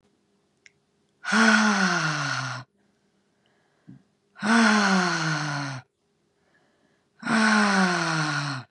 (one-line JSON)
{"exhalation_length": "8.7 s", "exhalation_amplitude": 18343, "exhalation_signal_mean_std_ratio": 0.58, "survey_phase": "beta (2021-08-13 to 2022-03-07)", "age": "45-64", "gender": "Female", "wearing_mask": "No", "symptom_cough_any": true, "symptom_new_continuous_cough": true, "symptom_runny_or_blocked_nose": true, "symptom_sore_throat": true, "symptom_fatigue": true, "symptom_fever_high_temperature": true, "symptom_headache": true, "symptom_onset": "2 days", "smoker_status": "Never smoked", "respiratory_condition_asthma": false, "respiratory_condition_other": false, "recruitment_source": "Test and Trace", "submission_delay": "1 day", "covid_test_result": "Positive", "covid_test_method": "RT-qPCR", "covid_ct_value": 27.5, "covid_ct_gene": "ORF1ab gene", "covid_ct_mean": 27.7, "covid_viral_load": "810 copies/ml", "covid_viral_load_category": "Minimal viral load (< 10K copies/ml)"}